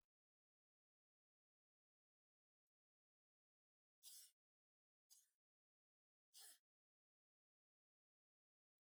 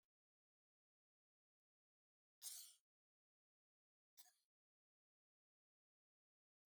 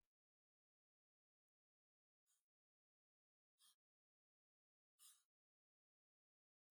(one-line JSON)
{"three_cough_length": "8.9 s", "three_cough_amplitude": 124, "three_cough_signal_mean_std_ratio": 0.19, "cough_length": "6.7 s", "cough_amplitude": 339, "cough_signal_mean_std_ratio": 0.17, "exhalation_length": "6.8 s", "exhalation_amplitude": 59, "exhalation_signal_mean_std_ratio": 0.17, "survey_phase": "beta (2021-08-13 to 2022-03-07)", "age": "65+", "gender": "Female", "wearing_mask": "No", "symptom_none": true, "smoker_status": "Never smoked", "respiratory_condition_asthma": false, "respiratory_condition_other": false, "recruitment_source": "REACT", "submission_delay": "1 day", "covid_test_result": "Negative", "covid_test_method": "RT-qPCR", "influenza_a_test_result": "Negative", "influenza_b_test_result": "Negative"}